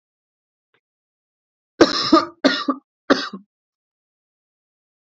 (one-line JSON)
{"three_cough_length": "5.1 s", "three_cough_amplitude": 29241, "three_cough_signal_mean_std_ratio": 0.27, "survey_phase": "alpha (2021-03-01 to 2021-08-12)", "age": "18-44", "gender": "Male", "wearing_mask": "No", "symptom_cough_any": true, "symptom_new_continuous_cough": true, "symptom_fatigue": true, "symptom_fever_high_temperature": true, "symptom_headache": true, "symptom_change_to_sense_of_smell_or_taste": true, "symptom_loss_of_taste": true, "symptom_onset": "3 days", "smoker_status": "Never smoked", "respiratory_condition_asthma": false, "respiratory_condition_other": false, "recruitment_source": "Test and Trace", "submission_delay": "2 days", "covid_ct_value": 27.2, "covid_ct_gene": "ORF1ab gene"}